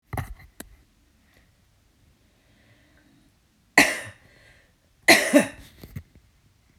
cough_length: 6.8 s
cough_amplitude: 32392
cough_signal_mean_std_ratio: 0.23
survey_phase: beta (2021-08-13 to 2022-03-07)
age: 45-64
gender: Female
wearing_mask: 'No'
symptom_none: true
smoker_status: Ex-smoker
respiratory_condition_asthma: false
respiratory_condition_other: false
recruitment_source: REACT
submission_delay: 1 day
covid_test_result: Negative
covid_test_method: RT-qPCR
covid_ct_value: 37.0
covid_ct_gene: N gene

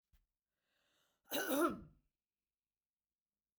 cough_length: 3.6 s
cough_amplitude: 2444
cough_signal_mean_std_ratio: 0.28
survey_phase: beta (2021-08-13 to 2022-03-07)
age: 65+
gender: Female
wearing_mask: 'No'
symptom_none: true
smoker_status: Never smoked
respiratory_condition_asthma: false
respiratory_condition_other: false
recruitment_source: REACT
submission_delay: 2 days
covid_test_result: Negative
covid_test_method: RT-qPCR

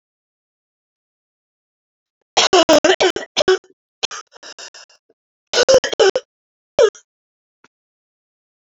cough_length: 8.6 s
cough_amplitude: 32648
cough_signal_mean_std_ratio: 0.32
survey_phase: alpha (2021-03-01 to 2021-08-12)
age: 18-44
gender: Female
wearing_mask: 'No'
symptom_new_continuous_cough: true
symptom_fatigue: true
smoker_status: Never smoked
respiratory_condition_asthma: true
respiratory_condition_other: false
recruitment_source: Test and Trace
submission_delay: 1 day
covid_test_result: Positive
covid_test_method: RT-qPCR
covid_ct_value: 22.2
covid_ct_gene: ORF1ab gene
covid_ct_mean: 23.4
covid_viral_load: 21000 copies/ml
covid_viral_load_category: Low viral load (10K-1M copies/ml)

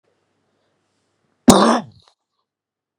cough_length: 3.0 s
cough_amplitude: 32768
cough_signal_mean_std_ratio: 0.24
survey_phase: beta (2021-08-13 to 2022-03-07)
age: 18-44
gender: Female
wearing_mask: 'No'
symptom_cough_any: true
symptom_runny_or_blocked_nose: true
symptom_sore_throat: true
symptom_fatigue: true
symptom_fever_high_temperature: true
symptom_headache: true
symptom_change_to_sense_of_smell_or_taste: true
symptom_loss_of_taste: true
symptom_onset: 2 days
smoker_status: Never smoked
respiratory_condition_asthma: false
respiratory_condition_other: false
recruitment_source: Test and Trace
submission_delay: 2 days
covid_test_result: Positive
covid_test_method: RT-qPCR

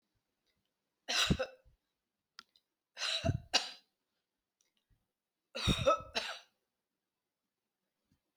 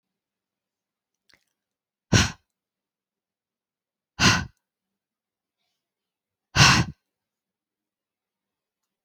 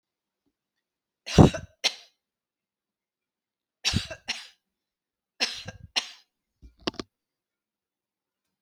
three_cough_length: 8.4 s
three_cough_amplitude: 6063
three_cough_signal_mean_std_ratio: 0.31
exhalation_length: 9.0 s
exhalation_amplitude: 24721
exhalation_signal_mean_std_ratio: 0.21
cough_length: 8.6 s
cough_amplitude: 26870
cough_signal_mean_std_ratio: 0.18
survey_phase: beta (2021-08-13 to 2022-03-07)
age: 45-64
gender: Female
wearing_mask: 'No'
symptom_none: true
symptom_onset: 4 days
smoker_status: Never smoked
respiratory_condition_asthma: true
respiratory_condition_other: false
recruitment_source: REACT
submission_delay: 2 days
covid_test_result: Negative
covid_test_method: RT-qPCR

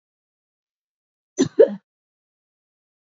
cough_length: 3.1 s
cough_amplitude: 26497
cough_signal_mean_std_ratio: 0.18
survey_phase: beta (2021-08-13 to 2022-03-07)
age: 65+
gender: Female
wearing_mask: 'No'
symptom_runny_or_blocked_nose: true
symptom_sore_throat: true
symptom_fatigue: true
symptom_other: true
smoker_status: Never smoked
respiratory_condition_asthma: true
respiratory_condition_other: false
recruitment_source: Test and Trace
submission_delay: 2 days
covid_test_result: Positive
covid_test_method: ePCR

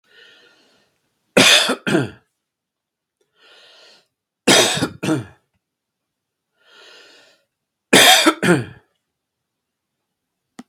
three_cough_length: 10.7 s
three_cough_amplitude: 32767
three_cough_signal_mean_std_ratio: 0.32
survey_phase: beta (2021-08-13 to 2022-03-07)
age: 65+
gender: Male
wearing_mask: 'No'
symptom_runny_or_blocked_nose: true
symptom_onset: 9 days
smoker_status: Ex-smoker
respiratory_condition_asthma: false
respiratory_condition_other: false
recruitment_source: REACT
submission_delay: 1 day
covid_test_result: Negative
covid_test_method: RT-qPCR
influenza_a_test_result: Negative
influenza_b_test_result: Negative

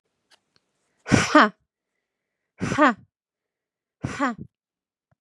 exhalation_length: 5.2 s
exhalation_amplitude: 31089
exhalation_signal_mean_std_ratio: 0.27
survey_phase: beta (2021-08-13 to 2022-03-07)
age: 45-64
gender: Female
wearing_mask: 'No'
symptom_none: true
smoker_status: Never smoked
respiratory_condition_asthma: false
respiratory_condition_other: false
recruitment_source: REACT
submission_delay: 5 days
covid_test_result: Negative
covid_test_method: RT-qPCR
influenza_a_test_result: Negative
influenza_b_test_result: Negative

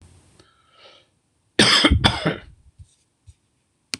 cough_length: 4.0 s
cough_amplitude: 26027
cough_signal_mean_std_ratio: 0.33
survey_phase: beta (2021-08-13 to 2022-03-07)
age: 65+
gender: Male
wearing_mask: 'No'
symptom_none: true
smoker_status: Ex-smoker
respiratory_condition_asthma: false
respiratory_condition_other: false
recruitment_source: REACT
submission_delay: 0 days
covid_test_result: Negative
covid_test_method: RT-qPCR
influenza_a_test_result: Negative
influenza_b_test_result: Negative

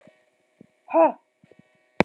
exhalation_length: 2.0 s
exhalation_amplitude: 32767
exhalation_signal_mean_std_ratio: 0.26
survey_phase: alpha (2021-03-01 to 2021-08-12)
age: 18-44
gender: Female
wearing_mask: 'No'
symptom_cough_any: true
symptom_abdominal_pain: true
symptom_fatigue: true
symptom_fever_high_temperature: true
symptom_headache: true
symptom_onset: 4 days
smoker_status: Ex-smoker
respiratory_condition_asthma: false
respiratory_condition_other: false
recruitment_source: Test and Trace
submission_delay: 2 days
covid_test_result: Positive
covid_test_method: RT-qPCR
covid_ct_value: 22.1
covid_ct_gene: ORF1ab gene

